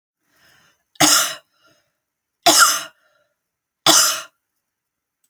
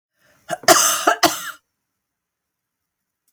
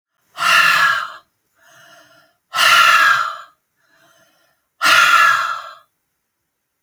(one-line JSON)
{"three_cough_length": "5.3 s", "three_cough_amplitude": 32768, "three_cough_signal_mean_std_ratio": 0.34, "cough_length": "3.3 s", "cough_amplitude": 32767, "cough_signal_mean_std_ratio": 0.33, "exhalation_length": "6.8 s", "exhalation_amplitude": 32767, "exhalation_signal_mean_std_ratio": 0.49, "survey_phase": "alpha (2021-03-01 to 2021-08-12)", "age": "45-64", "gender": "Female", "wearing_mask": "No", "symptom_none": true, "smoker_status": "Never smoked", "respiratory_condition_asthma": false, "respiratory_condition_other": false, "recruitment_source": "REACT", "submission_delay": "1 day", "covid_test_result": "Negative", "covid_test_method": "RT-qPCR"}